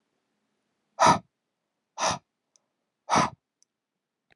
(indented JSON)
{
  "exhalation_length": "4.4 s",
  "exhalation_amplitude": 16912,
  "exhalation_signal_mean_std_ratio": 0.26,
  "survey_phase": "beta (2021-08-13 to 2022-03-07)",
  "age": "45-64",
  "gender": "Male",
  "wearing_mask": "No",
  "symptom_abdominal_pain": true,
  "symptom_fatigue": true,
  "symptom_fever_high_temperature": true,
  "symptom_onset": "12 days",
  "smoker_status": "Never smoked",
  "respiratory_condition_asthma": false,
  "respiratory_condition_other": false,
  "recruitment_source": "REACT",
  "submission_delay": "1 day",
  "covid_test_result": "Negative",
  "covid_test_method": "RT-qPCR"
}